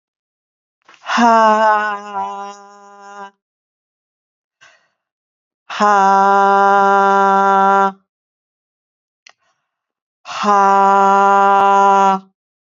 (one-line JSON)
{"exhalation_length": "12.7 s", "exhalation_amplitude": 30690, "exhalation_signal_mean_std_ratio": 0.5, "survey_phase": "beta (2021-08-13 to 2022-03-07)", "age": "65+", "gender": "Female", "wearing_mask": "No", "symptom_none": true, "smoker_status": "Never smoked", "respiratory_condition_asthma": false, "respiratory_condition_other": false, "recruitment_source": "REACT", "submission_delay": "1 day", "covid_test_result": "Negative", "covid_test_method": "RT-qPCR"}